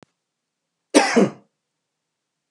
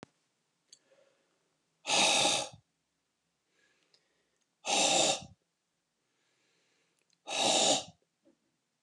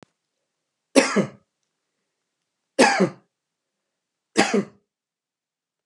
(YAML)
cough_length: 2.5 s
cough_amplitude: 28686
cough_signal_mean_std_ratio: 0.27
exhalation_length: 8.8 s
exhalation_amplitude: 6213
exhalation_signal_mean_std_ratio: 0.36
three_cough_length: 5.9 s
three_cough_amplitude: 31173
three_cough_signal_mean_std_ratio: 0.28
survey_phase: beta (2021-08-13 to 2022-03-07)
age: 45-64
gender: Male
wearing_mask: 'No'
symptom_none: true
smoker_status: Never smoked
respiratory_condition_asthma: false
respiratory_condition_other: false
recruitment_source: REACT
submission_delay: 3 days
covid_test_result: Negative
covid_test_method: RT-qPCR